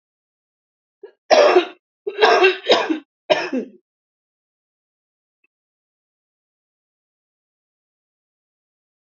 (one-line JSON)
{"cough_length": "9.1 s", "cough_amplitude": 32768, "cough_signal_mean_std_ratio": 0.29, "survey_phase": "alpha (2021-03-01 to 2021-08-12)", "age": "45-64", "gender": "Female", "wearing_mask": "No", "symptom_none": true, "smoker_status": "Ex-smoker", "respiratory_condition_asthma": false, "respiratory_condition_other": false, "recruitment_source": "REACT", "submission_delay": "2 days", "covid_test_result": "Negative", "covid_test_method": "RT-qPCR"}